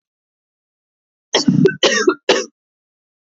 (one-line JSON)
{"three_cough_length": "3.2 s", "three_cough_amplitude": 28877, "three_cough_signal_mean_std_ratio": 0.39, "survey_phase": "alpha (2021-03-01 to 2021-08-12)", "age": "18-44", "gender": "Female", "wearing_mask": "No", "symptom_shortness_of_breath": true, "symptom_abdominal_pain": true, "symptom_fatigue": true, "symptom_change_to_sense_of_smell_or_taste": true, "symptom_onset": "4 days", "smoker_status": "Never smoked", "respiratory_condition_asthma": true, "respiratory_condition_other": false, "recruitment_source": "Test and Trace", "submission_delay": "2 days", "covid_test_result": "Positive", "covid_test_method": "RT-qPCR"}